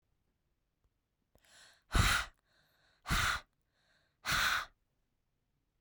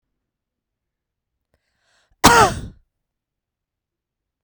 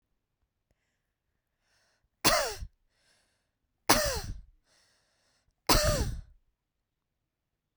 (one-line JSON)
{"exhalation_length": "5.8 s", "exhalation_amplitude": 4957, "exhalation_signal_mean_std_ratio": 0.34, "cough_length": "4.4 s", "cough_amplitude": 32768, "cough_signal_mean_std_ratio": 0.2, "three_cough_length": "7.8 s", "three_cough_amplitude": 17650, "three_cough_signal_mean_std_ratio": 0.29, "survey_phase": "beta (2021-08-13 to 2022-03-07)", "age": "45-64", "gender": "Female", "wearing_mask": "No", "symptom_none": true, "smoker_status": "Never smoked", "respiratory_condition_asthma": false, "respiratory_condition_other": false, "recruitment_source": "REACT", "submission_delay": "1 day", "covid_test_result": "Negative", "covid_test_method": "RT-qPCR", "influenza_a_test_result": "Negative", "influenza_b_test_result": "Negative"}